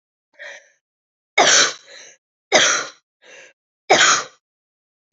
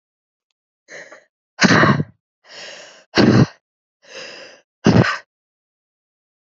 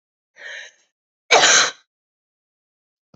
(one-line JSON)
{"three_cough_length": "5.1 s", "three_cough_amplitude": 32009, "three_cough_signal_mean_std_ratio": 0.36, "exhalation_length": "6.5 s", "exhalation_amplitude": 31561, "exhalation_signal_mean_std_ratio": 0.34, "cough_length": "3.2 s", "cough_amplitude": 29747, "cough_signal_mean_std_ratio": 0.3, "survey_phase": "alpha (2021-03-01 to 2021-08-12)", "age": "18-44", "gender": "Female", "wearing_mask": "No", "symptom_abdominal_pain": true, "symptom_fatigue": true, "symptom_headache": true, "symptom_onset": "2 days", "smoker_status": "Never smoked", "respiratory_condition_asthma": false, "respiratory_condition_other": false, "recruitment_source": "Test and Trace", "submission_delay": "2 days", "covid_test_result": "Positive", "covid_test_method": "RT-qPCR"}